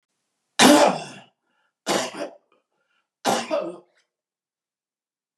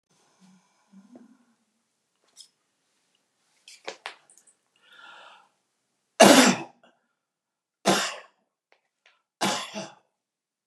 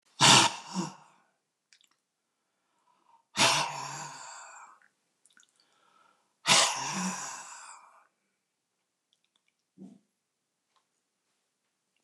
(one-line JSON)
{"three_cough_length": "5.4 s", "three_cough_amplitude": 29917, "three_cough_signal_mean_std_ratio": 0.32, "cough_length": "10.7 s", "cough_amplitude": 26909, "cough_signal_mean_std_ratio": 0.21, "exhalation_length": "12.0 s", "exhalation_amplitude": 16647, "exhalation_signal_mean_std_ratio": 0.28, "survey_phase": "beta (2021-08-13 to 2022-03-07)", "age": "65+", "gender": "Male", "wearing_mask": "No", "symptom_none": true, "smoker_status": "Ex-smoker", "respiratory_condition_asthma": false, "respiratory_condition_other": false, "recruitment_source": "REACT", "submission_delay": "2 days", "covid_test_result": "Negative", "covid_test_method": "RT-qPCR", "influenza_a_test_result": "Negative", "influenza_b_test_result": "Negative"}